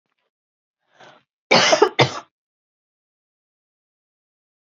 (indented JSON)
{
  "cough_length": "4.6 s",
  "cough_amplitude": 32767,
  "cough_signal_mean_std_ratio": 0.25,
  "survey_phase": "beta (2021-08-13 to 2022-03-07)",
  "age": "18-44",
  "gender": "Female",
  "wearing_mask": "No",
  "symptom_fatigue": true,
  "symptom_headache": true,
  "smoker_status": "Never smoked",
  "respiratory_condition_asthma": false,
  "respiratory_condition_other": false,
  "recruitment_source": "Test and Trace",
  "submission_delay": "2 days",
  "covid_test_result": "Positive",
  "covid_test_method": "ePCR"
}